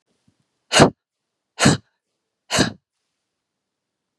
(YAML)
exhalation_length: 4.2 s
exhalation_amplitude: 32768
exhalation_signal_mean_std_ratio: 0.26
survey_phase: beta (2021-08-13 to 2022-03-07)
age: 45-64
gender: Female
wearing_mask: 'No'
symptom_none: true
smoker_status: Never smoked
respiratory_condition_asthma: false
respiratory_condition_other: false
recruitment_source: REACT
submission_delay: 1 day
covid_test_result: Negative
covid_test_method: RT-qPCR